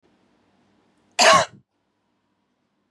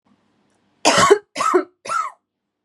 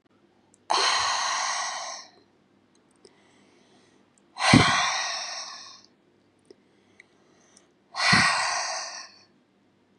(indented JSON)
{
  "cough_length": "2.9 s",
  "cough_amplitude": 28997,
  "cough_signal_mean_std_ratio": 0.25,
  "three_cough_length": "2.6 s",
  "three_cough_amplitude": 31831,
  "three_cough_signal_mean_std_ratio": 0.42,
  "exhalation_length": "10.0 s",
  "exhalation_amplitude": 27883,
  "exhalation_signal_mean_std_ratio": 0.43,
  "survey_phase": "beta (2021-08-13 to 2022-03-07)",
  "age": "18-44",
  "gender": "Female",
  "wearing_mask": "No",
  "symptom_none": true,
  "smoker_status": "Never smoked",
  "respiratory_condition_asthma": false,
  "respiratory_condition_other": false,
  "recruitment_source": "REACT",
  "submission_delay": "2 days",
  "covid_test_result": "Negative",
  "covid_test_method": "RT-qPCR",
  "influenza_a_test_result": "Negative",
  "influenza_b_test_result": "Negative"
}